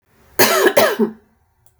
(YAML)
cough_length: 1.8 s
cough_amplitude: 32768
cough_signal_mean_std_ratio: 0.5
survey_phase: beta (2021-08-13 to 2022-03-07)
age: 45-64
gender: Female
wearing_mask: 'No'
symptom_headache: true
symptom_onset: 5 days
smoker_status: Ex-smoker
respiratory_condition_asthma: false
respiratory_condition_other: false
recruitment_source: REACT
submission_delay: 2 days
covid_test_result: Negative
covid_test_method: RT-qPCR
influenza_a_test_result: Negative
influenza_b_test_result: Negative